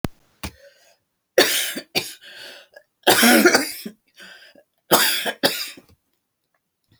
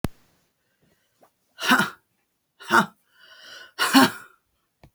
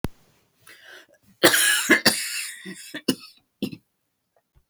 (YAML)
three_cough_length: 7.0 s
three_cough_amplitude: 32768
three_cough_signal_mean_std_ratio: 0.39
exhalation_length: 4.9 s
exhalation_amplitude: 24431
exhalation_signal_mean_std_ratio: 0.3
cough_length: 4.7 s
cough_amplitude: 30784
cough_signal_mean_std_ratio: 0.37
survey_phase: beta (2021-08-13 to 2022-03-07)
age: 65+
gender: Female
wearing_mask: 'No'
symptom_none: true
smoker_status: Ex-smoker
respiratory_condition_asthma: false
respiratory_condition_other: false
recruitment_source: REACT
submission_delay: 1 day
covid_test_result: Negative
covid_test_method: RT-qPCR
influenza_a_test_result: Negative
influenza_b_test_result: Negative